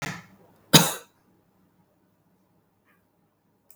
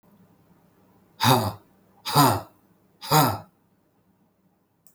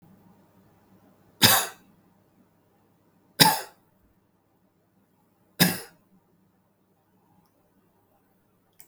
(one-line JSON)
{"cough_length": "3.8 s", "cough_amplitude": 32768, "cough_signal_mean_std_ratio": 0.18, "exhalation_length": "4.9 s", "exhalation_amplitude": 19986, "exhalation_signal_mean_std_ratio": 0.34, "three_cough_length": "8.9 s", "three_cough_amplitude": 32768, "three_cough_signal_mean_std_ratio": 0.2, "survey_phase": "beta (2021-08-13 to 2022-03-07)", "age": "65+", "gender": "Male", "wearing_mask": "No", "symptom_none": true, "smoker_status": "Ex-smoker", "respiratory_condition_asthma": false, "respiratory_condition_other": false, "recruitment_source": "REACT", "submission_delay": "2 days", "covid_test_result": "Negative", "covid_test_method": "RT-qPCR"}